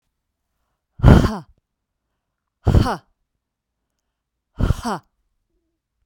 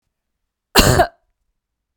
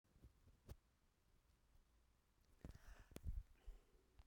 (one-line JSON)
{"exhalation_length": "6.1 s", "exhalation_amplitude": 32768, "exhalation_signal_mean_std_ratio": 0.26, "cough_length": "2.0 s", "cough_amplitude": 32768, "cough_signal_mean_std_ratio": 0.31, "three_cough_length": "4.3 s", "three_cough_amplitude": 699, "three_cough_signal_mean_std_ratio": 0.4, "survey_phase": "beta (2021-08-13 to 2022-03-07)", "age": "45-64", "gender": "Female", "wearing_mask": "No", "symptom_fatigue": true, "symptom_headache": true, "smoker_status": "Never smoked", "respiratory_condition_asthma": true, "respiratory_condition_other": false, "recruitment_source": "Test and Trace", "submission_delay": "2 days", "covid_test_result": "Negative", "covid_test_method": "RT-qPCR"}